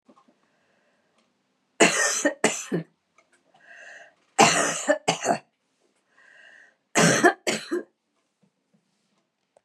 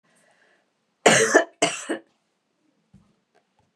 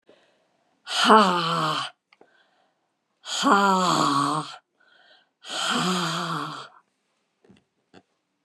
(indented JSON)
{
  "three_cough_length": "9.6 s",
  "three_cough_amplitude": 26090,
  "three_cough_signal_mean_std_ratio": 0.35,
  "cough_length": "3.8 s",
  "cough_amplitude": 30755,
  "cough_signal_mean_std_ratio": 0.29,
  "exhalation_length": "8.4 s",
  "exhalation_amplitude": 25832,
  "exhalation_signal_mean_std_ratio": 0.47,
  "survey_phase": "beta (2021-08-13 to 2022-03-07)",
  "age": "65+",
  "gender": "Female",
  "wearing_mask": "No",
  "symptom_none": true,
  "symptom_onset": "13 days",
  "smoker_status": "Never smoked",
  "respiratory_condition_asthma": false,
  "respiratory_condition_other": false,
  "recruitment_source": "REACT",
  "submission_delay": "1 day",
  "covid_test_result": "Negative",
  "covid_test_method": "RT-qPCR",
  "influenza_a_test_result": "Negative",
  "influenza_b_test_result": "Negative"
}